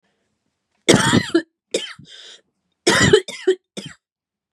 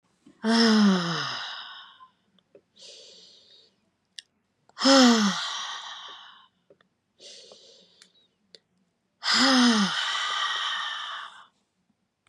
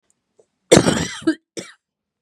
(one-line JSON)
{"three_cough_length": "4.5 s", "three_cough_amplitude": 32768, "three_cough_signal_mean_std_ratio": 0.37, "exhalation_length": "12.3 s", "exhalation_amplitude": 16699, "exhalation_signal_mean_std_ratio": 0.45, "cough_length": "2.2 s", "cough_amplitude": 32768, "cough_signal_mean_std_ratio": 0.32, "survey_phase": "beta (2021-08-13 to 2022-03-07)", "age": "45-64", "gender": "Female", "wearing_mask": "No", "symptom_none": true, "smoker_status": "Never smoked", "respiratory_condition_asthma": false, "respiratory_condition_other": false, "recruitment_source": "Test and Trace", "submission_delay": "2 days", "covid_test_result": "Negative", "covid_test_method": "RT-qPCR"}